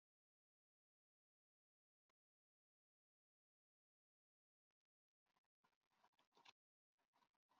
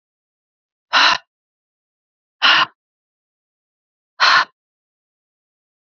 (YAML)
cough_length: 7.6 s
cough_amplitude: 94
cough_signal_mean_std_ratio: 0.17
exhalation_length: 5.9 s
exhalation_amplitude: 32767
exhalation_signal_mean_std_ratio: 0.28
survey_phase: beta (2021-08-13 to 2022-03-07)
age: 18-44
gender: Female
wearing_mask: 'No'
symptom_cough_any: true
symptom_runny_or_blocked_nose: true
symptom_shortness_of_breath: true
symptom_onset: 2 days
smoker_status: Never smoked
respiratory_condition_asthma: false
respiratory_condition_other: false
recruitment_source: REACT
submission_delay: 1 day
covid_test_result: Negative
covid_test_method: RT-qPCR
influenza_a_test_result: Unknown/Void
influenza_b_test_result: Unknown/Void